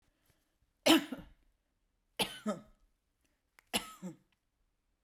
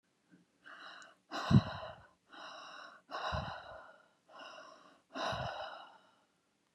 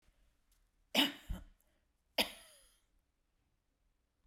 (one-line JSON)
{"three_cough_length": "5.0 s", "three_cough_amplitude": 8543, "three_cough_signal_mean_std_ratio": 0.24, "exhalation_length": "6.7 s", "exhalation_amplitude": 7269, "exhalation_signal_mean_std_ratio": 0.35, "cough_length": "4.3 s", "cough_amplitude": 5415, "cough_signal_mean_std_ratio": 0.23, "survey_phase": "beta (2021-08-13 to 2022-03-07)", "age": "45-64", "gender": "Female", "wearing_mask": "No", "symptom_none": true, "smoker_status": "Never smoked", "respiratory_condition_asthma": true, "respiratory_condition_other": false, "recruitment_source": "REACT", "submission_delay": "2 days", "covid_test_result": "Negative", "covid_test_method": "RT-qPCR"}